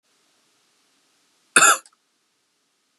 {"cough_length": "3.0 s", "cough_amplitude": 32560, "cough_signal_mean_std_ratio": 0.21, "survey_phase": "beta (2021-08-13 to 2022-03-07)", "age": "18-44", "gender": "Male", "wearing_mask": "No", "symptom_runny_or_blocked_nose": true, "symptom_change_to_sense_of_smell_or_taste": true, "symptom_onset": "11 days", "smoker_status": "Never smoked", "respiratory_condition_asthma": false, "respiratory_condition_other": false, "recruitment_source": "REACT", "submission_delay": "1 day", "covid_test_result": "Negative", "covid_test_method": "RT-qPCR", "influenza_a_test_result": "Negative", "influenza_b_test_result": "Negative"}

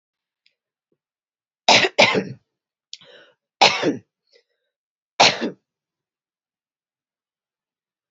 {"three_cough_length": "8.1 s", "three_cough_amplitude": 32767, "three_cough_signal_mean_std_ratio": 0.26, "survey_phase": "beta (2021-08-13 to 2022-03-07)", "age": "45-64", "gender": "Female", "wearing_mask": "No", "symptom_runny_or_blocked_nose": true, "smoker_status": "Ex-smoker", "respiratory_condition_asthma": false, "respiratory_condition_other": false, "recruitment_source": "REACT", "submission_delay": "0 days", "covid_test_result": "Negative", "covid_test_method": "RT-qPCR", "influenza_a_test_result": "Negative", "influenza_b_test_result": "Negative"}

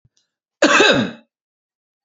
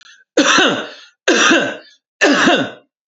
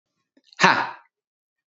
{"cough_length": "2.0 s", "cough_amplitude": 28549, "cough_signal_mean_std_ratio": 0.39, "three_cough_length": "3.1 s", "three_cough_amplitude": 31122, "three_cough_signal_mean_std_ratio": 0.61, "exhalation_length": "1.7 s", "exhalation_amplitude": 28717, "exhalation_signal_mean_std_ratio": 0.28, "survey_phase": "beta (2021-08-13 to 2022-03-07)", "age": "45-64", "gender": "Male", "wearing_mask": "No", "symptom_none": true, "smoker_status": "Never smoked", "respiratory_condition_asthma": false, "respiratory_condition_other": false, "recruitment_source": "REACT", "submission_delay": "3 days", "covid_test_result": "Negative", "covid_test_method": "RT-qPCR", "influenza_a_test_result": "Unknown/Void", "influenza_b_test_result": "Unknown/Void"}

